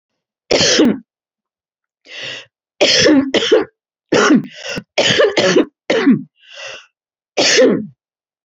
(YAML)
three_cough_length: 8.4 s
three_cough_amplitude: 32767
three_cough_signal_mean_std_ratio: 0.54
survey_phase: beta (2021-08-13 to 2022-03-07)
age: 65+
gender: Female
wearing_mask: 'No'
symptom_new_continuous_cough: true
symptom_runny_or_blocked_nose: true
symptom_fatigue: true
symptom_fever_high_temperature: true
symptom_onset: 5 days
smoker_status: Never smoked
respiratory_condition_asthma: false
respiratory_condition_other: false
recruitment_source: Test and Trace
submission_delay: 2 days
covid_test_result: Positive
covid_test_method: ePCR